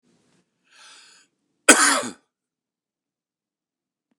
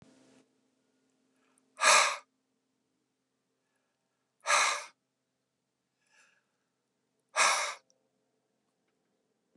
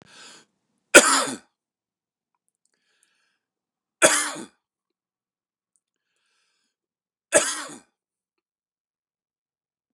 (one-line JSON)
{"cough_length": "4.2 s", "cough_amplitude": 29204, "cough_signal_mean_std_ratio": 0.21, "exhalation_length": "9.6 s", "exhalation_amplitude": 13080, "exhalation_signal_mean_std_ratio": 0.25, "three_cough_length": "9.9 s", "three_cough_amplitude": 29204, "three_cough_signal_mean_std_ratio": 0.19, "survey_phase": "beta (2021-08-13 to 2022-03-07)", "age": "65+", "gender": "Male", "wearing_mask": "No", "symptom_none": true, "smoker_status": "Ex-smoker", "respiratory_condition_asthma": false, "respiratory_condition_other": false, "recruitment_source": "REACT", "submission_delay": "8 days", "covid_test_result": "Negative", "covid_test_method": "RT-qPCR"}